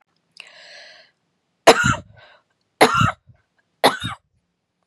{
  "three_cough_length": "4.9 s",
  "three_cough_amplitude": 32768,
  "three_cough_signal_mean_std_ratio": 0.29,
  "survey_phase": "beta (2021-08-13 to 2022-03-07)",
  "age": "45-64",
  "gender": "Female",
  "wearing_mask": "No",
  "symptom_cough_any": true,
  "symptom_abdominal_pain": true,
  "symptom_headache": true,
  "symptom_onset": "12 days",
  "smoker_status": "Never smoked",
  "respiratory_condition_asthma": false,
  "respiratory_condition_other": false,
  "recruitment_source": "REACT",
  "submission_delay": "1 day",
  "covid_test_result": "Negative",
  "covid_test_method": "RT-qPCR",
  "influenza_a_test_result": "Negative",
  "influenza_b_test_result": "Negative"
}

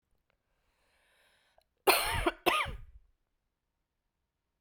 {
  "cough_length": "4.6 s",
  "cough_amplitude": 12089,
  "cough_signal_mean_std_ratio": 0.29,
  "survey_phase": "beta (2021-08-13 to 2022-03-07)",
  "age": "45-64",
  "gender": "Female",
  "wearing_mask": "No",
  "symptom_cough_any": true,
  "symptom_runny_or_blocked_nose": true,
  "symptom_sore_throat": true,
  "symptom_fatigue": true,
  "symptom_fever_high_temperature": true,
  "symptom_headache": true,
  "symptom_change_to_sense_of_smell_or_taste": true,
  "smoker_status": "Ex-smoker",
  "respiratory_condition_asthma": true,
  "respiratory_condition_other": false,
  "recruitment_source": "Test and Trace",
  "submission_delay": "1 day",
  "covid_test_result": "Positive",
  "covid_test_method": "ePCR"
}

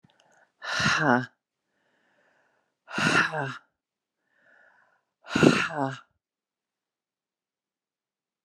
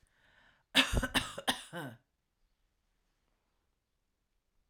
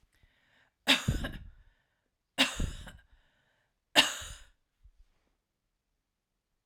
{
  "exhalation_length": "8.4 s",
  "exhalation_amplitude": 23433,
  "exhalation_signal_mean_std_ratio": 0.32,
  "cough_length": "4.7 s",
  "cough_amplitude": 8317,
  "cough_signal_mean_std_ratio": 0.27,
  "three_cough_length": "6.7 s",
  "three_cough_amplitude": 14200,
  "three_cough_signal_mean_std_ratio": 0.27,
  "survey_phase": "alpha (2021-03-01 to 2021-08-12)",
  "age": "45-64",
  "gender": "Female",
  "wearing_mask": "No",
  "symptom_none": true,
  "symptom_onset": "6 days",
  "smoker_status": "Never smoked",
  "respiratory_condition_asthma": false,
  "respiratory_condition_other": false,
  "recruitment_source": "REACT",
  "submission_delay": "3 days",
  "covid_test_result": "Negative",
  "covid_test_method": "RT-qPCR"
}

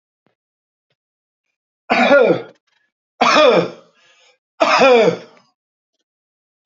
{
  "three_cough_length": "6.7 s",
  "three_cough_amplitude": 28802,
  "three_cough_signal_mean_std_ratio": 0.41,
  "survey_phase": "alpha (2021-03-01 to 2021-08-12)",
  "age": "65+",
  "gender": "Male",
  "wearing_mask": "No",
  "symptom_none": true,
  "smoker_status": "Ex-smoker",
  "respiratory_condition_asthma": false,
  "respiratory_condition_other": false,
  "recruitment_source": "REACT",
  "submission_delay": "2 days",
  "covid_test_result": "Negative",
  "covid_test_method": "RT-qPCR"
}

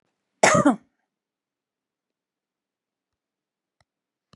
{
  "cough_length": "4.4 s",
  "cough_amplitude": 27633,
  "cough_signal_mean_std_ratio": 0.2,
  "survey_phase": "beta (2021-08-13 to 2022-03-07)",
  "age": "65+",
  "gender": "Female",
  "wearing_mask": "No",
  "symptom_none": true,
  "smoker_status": "Never smoked",
  "respiratory_condition_asthma": false,
  "respiratory_condition_other": false,
  "recruitment_source": "REACT",
  "submission_delay": "2 days",
  "covid_test_result": "Negative",
  "covid_test_method": "RT-qPCR",
  "influenza_a_test_result": "Negative",
  "influenza_b_test_result": "Negative"
}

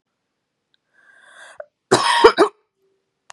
{
  "cough_length": "3.3 s",
  "cough_amplitude": 32768,
  "cough_signal_mean_std_ratio": 0.29,
  "survey_phase": "beta (2021-08-13 to 2022-03-07)",
  "age": "18-44",
  "gender": "Female",
  "wearing_mask": "No",
  "symptom_cough_any": true,
  "symptom_runny_or_blocked_nose": true,
  "symptom_fatigue": true,
  "symptom_onset": "3 days",
  "smoker_status": "Ex-smoker",
  "respiratory_condition_asthma": false,
  "respiratory_condition_other": false,
  "recruitment_source": "REACT",
  "submission_delay": "3 days",
  "covid_test_result": "Negative",
  "covid_test_method": "RT-qPCR"
}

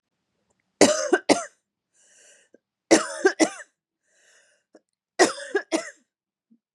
{
  "three_cough_length": "6.7 s",
  "three_cough_amplitude": 30352,
  "three_cough_signal_mean_std_ratio": 0.29,
  "survey_phase": "beta (2021-08-13 to 2022-03-07)",
  "age": "18-44",
  "gender": "Female",
  "wearing_mask": "No",
  "symptom_none": true,
  "symptom_onset": "13 days",
  "smoker_status": "Ex-smoker",
  "respiratory_condition_asthma": false,
  "respiratory_condition_other": false,
  "recruitment_source": "REACT",
  "submission_delay": "5 days",
  "covid_test_result": "Negative",
  "covid_test_method": "RT-qPCR",
  "influenza_a_test_result": "Negative",
  "influenza_b_test_result": "Negative"
}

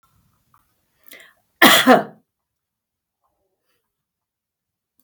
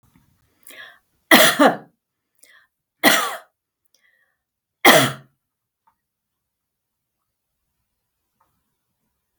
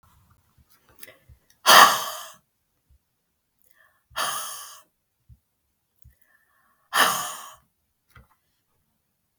{
  "cough_length": "5.0 s",
  "cough_amplitude": 32768,
  "cough_signal_mean_std_ratio": 0.22,
  "three_cough_length": "9.4 s",
  "three_cough_amplitude": 32768,
  "three_cough_signal_mean_std_ratio": 0.24,
  "exhalation_length": "9.4 s",
  "exhalation_amplitude": 32768,
  "exhalation_signal_mean_std_ratio": 0.23,
  "survey_phase": "beta (2021-08-13 to 2022-03-07)",
  "age": "45-64",
  "gender": "Female",
  "wearing_mask": "No",
  "symptom_cough_any": true,
  "smoker_status": "Never smoked",
  "respiratory_condition_asthma": false,
  "respiratory_condition_other": false,
  "recruitment_source": "REACT",
  "submission_delay": "2 days",
  "covid_test_result": "Negative",
  "covid_test_method": "RT-qPCR",
  "influenza_a_test_result": "Negative",
  "influenza_b_test_result": "Negative"
}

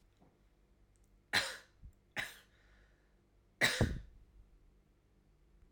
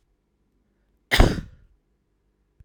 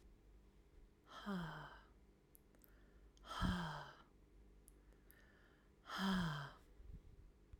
{
  "three_cough_length": "5.7 s",
  "three_cough_amplitude": 5243,
  "three_cough_signal_mean_std_ratio": 0.29,
  "cough_length": "2.6 s",
  "cough_amplitude": 32685,
  "cough_signal_mean_std_ratio": 0.22,
  "exhalation_length": "7.6 s",
  "exhalation_amplitude": 1347,
  "exhalation_signal_mean_std_ratio": 0.48,
  "survey_phase": "beta (2021-08-13 to 2022-03-07)",
  "age": "18-44",
  "gender": "Female",
  "wearing_mask": "No",
  "symptom_cough_any": true,
  "symptom_onset": "12 days",
  "smoker_status": "Never smoked",
  "respiratory_condition_asthma": false,
  "respiratory_condition_other": false,
  "recruitment_source": "REACT",
  "submission_delay": "1 day",
  "covid_test_result": "Negative",
  "covid_test_method": "RT-qPCR"
}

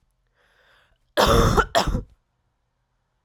{
  "cough_length": "3.2 s",
  "cough_amplitude": 26956,
  "cough_signal_mean_std_ratio": 0.38,
  "survey_phase": "alpha (2021-03-01 to 2021-08-12)",
  "age": "18-44",
  "gender": "Female",
  "wearing_mask": "No",
  "symptom_new_continuous_cough": true,
  "symptom_fatigue": true,
  "symptom_headache": true,
  "symptom_onset": "5 days",
  "smoker_status": "Never smoked",
  "respiratory_condition_asthma": false,
  "respiratory_condition_other": false,
  "recruitment_source": "Test and Trace",
  "submission_delay": "2 days",
  "covid_test_result": "Positive",
  "covid_test_method": "RT-qPCR"
}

